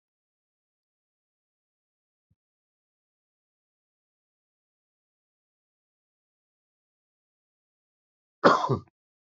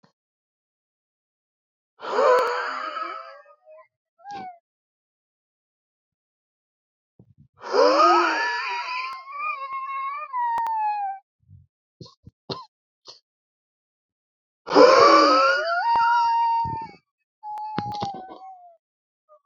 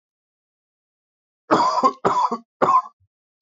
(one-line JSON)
{"cough_length": "9.2 s", "cough_amplitude": 26463, "cough_signal_mean_std_ratio": 0.13, "exhalation_length": "19.5 s", "exhalation_amplitude": 28330, "exhalation_signal_mean_std_ratio": 0.46, "three_cough_length": "3.4 s", "three_cough_amplitude": 27142, "three_cough_signal_mean_std_ratio": 0.42, "survey_phase": "beta (2021-08-13 to 2022-03-07)", "age": "18-44", "gender": "Male", "wearing_mask": "Yes", "symptom_cough_any": true, "symptom_runny_or_blocked_nose": true, "symptom_sore_throat": true, "symptom_diarrhoea": true, "symptom_fever_high_temperature": true, "symptom_headache": true, "symptom_other": true, "symptom_onset": "2 days", "smoker_status": "Current smoker (1 to 10 cigarettes per day)", "respiratory_condition_asthma": false, "respiratory_condition_other": false, "recruitment_source": "Test and Trace", "submission_delay": "2 days", "covid_test_result": "Positive", "covid_test_method": "RT-qPCR", "covid_ct_value": 17.8, "covid_ct_gene": "N gene"}